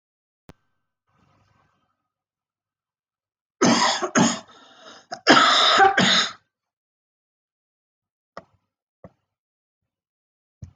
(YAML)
cough_length: 10.8 s
cough_amplitude: 26035
cough_signal_mean_std_ratio: 0.32
survey_phase: alpha (2021-03-01 to 2021-08-12)
age: 45-64
gender: Female
wearing_mask: 'No'
symptom_cough_any: true
symptom_shortness_of_breath: true
symptom_onset: 12 days
smoker_status: Never smoked
respiratory_condition_asthma: false
respiratory_condition_other: false
recruitment_source: REACT
submission_delay: 1 day
covid_test_result: Negative
covid_test_method: RT-qPCR